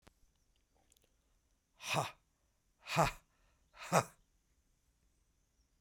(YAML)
exhalation_length: 5.8 s
exhalation_amplitude: 6315
exhalation_signal_mean_std_ratio: 0.24
survey_phase: beta (2021-08-13 to 2022-03-07)
age: 65+
gender: Male
wearing_mask: 'No'
symptom_runny_or_blocked_nose: true
smoker_status: Never smoked
respiratory_condition_asthma: false
respiratory_condition_other: false
recruitment_source: REACT
submission_delay: 1 day
covid_test_result: Negative
covid_test_method: RT-qPCR
influenza_a_test_result: Negative
influenza_b_test_result: Negative